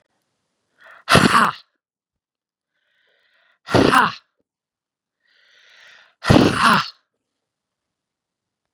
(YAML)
exhalation_length: 8.7 s
exhalation_amplitude: 32767
exhalation_signal_mean_std_ratio: 0.29
survey_phase: beta (2021-08-13 to 2022-03-07)
age: 45-64
gender: Female
wearing_mask: 'No'
symptom_runny_or_blocked_nose: true
symptom_headache: true
symptom_onset: 9 days
smoker_status: Never smoked
respiratory_condition_asthma: false
respiratory_condition_other: false
recruitment_source: REACT
submission_delay: 2 days
covid_test_result: Positive
covid_test_method: RT-qPCR
covid_ct_value: 26.0
covid_ct_gene: E gene
influenza_a_test_result: Negative
influenza_b_test_result: Negative